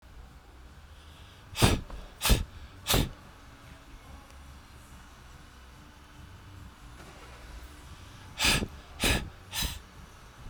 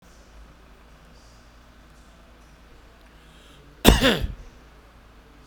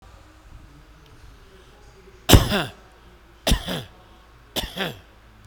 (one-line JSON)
{"exhalation_length": "10.5 s", "exhalation_amplitude": 19176, "exhalation_signal_mean_std_ratio": 0.41, "cough_length": "5.5 s", "cough_amplitude": 32768, "cough_signal_mean_std_ratio": 0.26, "three_cough_length": "5.5 s", "three_cough_amplitude": 32768, "three_cough_signal_mean_std_ratio": 0.29, "survey_phase": "beta (2021-08-13 to 2022-03-07)", "age": "45-64", "gender": "Male", "wearing_mask": "No", "symptom_none": true, "smoker_status": "Never smoked", "respiratory_condition_asthma": true, "respiratory_condition_other": false, "recruitment_source": "REACT", "submission_delay": "2 days", "covid_test_result": "Negative", "covid_test_method": "RT-qPCR"}